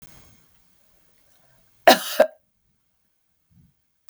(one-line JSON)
{"cough_length": "4.1 s", "cough_amplitude": 32766, "cough_signal_mean_std_ratio": 0.18, "survey_phase": "beta (2021-08-13 to 2022-03-07)", "age": "65+", "gender": "Female", "wearing_mask": "No", "symptom_none": true, "smoker_status": "Ex-smoker", "respiratory_condition_asthma": false, "respiratory_condition_other": false, "recruitment_source": "REACT", "submission_delay": "8 days", "covid_test_result": "Negative", "covid_test_method": "RT-qPCR"}